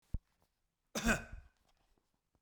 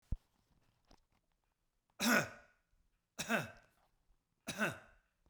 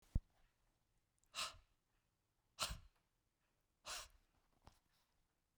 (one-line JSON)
{"cough_length": "2.4 s", "cough_amplitude": 3756, "cough_signal_mean_std_ratio": 0.28, "three_cough_length": "5.3 s", "three_cough_amplitude": 4249, "three_cough_signal_mean_std_ratio": 0.3, "exhalation_length": "5.6 s", "exhalation_amplitude": 1937, "exhalation_signal_mean_std_ratio": 0.23, "survey_phase": "beta (2021-08-13 to 2022-03-07)", "age": "45-64", "gender": "Male", "wearing_mask": "No", "symptom_none": true, "smoker_status": "Never smoked", "respiratory_condition_asthma": false, "respiratory_condition_other": false, "recruitment_source": "REACT", "submission_delay": "6 days", "covid_test_result": "Negative", "covid_test_method": "RT-qPCR"}